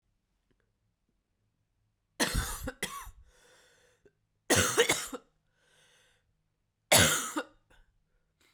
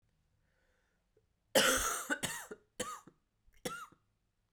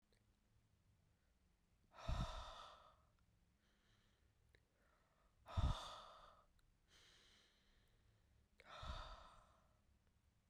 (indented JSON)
{
  "three_cough_length": "8.5 s",
  "three_cough_amplitude": 11127,
  "three_cough_signal_mean_std_ratio": 0.3,
  "cough_length": "4.5 s",
  "cough_amplitude": 7001,
  "cough_signal_mean_std_ratio": 0.35,
  "exhalation_length": "10.5 s",
  "exhalation_amplitude": 1113,
  "exhalation_signal_mean_std_ratio": 0.31,
  "survey_phase": "beta (2021-08-13 to 2022-03-07)",
  "age": "18-44",
  "gender": "Female",
  "wearing_mask": "No",
  "symptom_cough_any": true,
  "symptom_new_continuous_cough": true,
  "symptom_runny_or_blocked_nose": true,
  "symptom_fatigue": true,
  "symptom_fever_high_temperature": true,
  "symptom_headache": true,
  "symptom_change_to_sense_of_smell_or_taste": true,
  "symptom_loss_of_taste": true,
  "symptom_onset": "3 days",
  "smoker_status": "Ex-smoker",
  "respiratory_condition_asthma": false,
  "respiratory_condition_other": false,
  "recruitment_source": "Test and Trace",
  "submission_delay": "2 days",
  "covid_test_result": "Positive",
  "covid_test_method": "RT-qPCR",
  "covid_ct_value": 22.9,
  "covid_ct_gene": "ORF1ab gene"
}